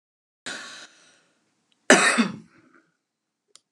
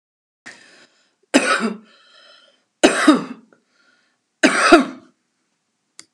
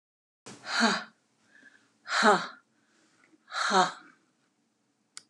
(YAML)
cough_length: 3.7 s
cough_amplitude: 31734
cough_signal_mean_std_ratio: 0.27
three_cough_length: 6.1 s
three_cough_amplitude: 32768
three_cough_signal_mean_std_ratio: 0.33
exhalation_length: 5.3 s
exhalation_amplitude: 12163
exhalation_signal_mean_std_ratio: 0.35
survey_phase: beta (2021-08-13 to 2022-03-07)
age: 65+
gender: Female
wearing_mask: 'No'
symptom_none: true
smoker_status: Never smoked
respiratory_condition_asthma: false
respiratory_condition_other: false
recruitment_source: REACT
submission_delay: 1 day
covid_test_result: Negative
covid_test_method: RT-qPCR
influenza_a_test_result: Unknown/Void
influenza_b_test_result: Unknown/Void